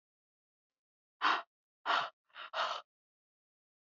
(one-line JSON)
{"exhalation_length": "3.8 s", "exhalation_amplitude": 4927, "exhalation_signal_mean_std_ratio": 0.33, "survey_phase": "beta (2021-08-13 to 2022-03-07)", "age": "18-44", "gender": "Female", "wearing_mask": "No", "symptom_none": true, "smoker_status": "Never smoked", "respiratory_condition_asthma": false, "respiratory_condition_other": false, "recruitment_source": "REACT", "submission_delay": "1 day", "covid_test_result": "Negative", "covid_test_method": "RT-qPCR"}